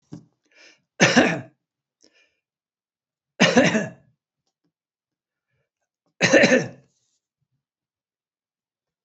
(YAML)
three_cough_length: 9.0 s
three_cough_amplitude: 29324
three_cough_signal_mean_std_ratio: 0.28
survey_phase: beta (2021-08-13 to 2022-03-07)
age: 65+
gender: Male
wearing_mask: 'No'
symptom_none: true
smoker_status: Never smoked
respiratory_condition_asthma: false
respiratory_condition_other: false
recruitment_source: REACT
submission_delay: 2 days
covid_test_result: Negative
covid_test_method: RT-qPCR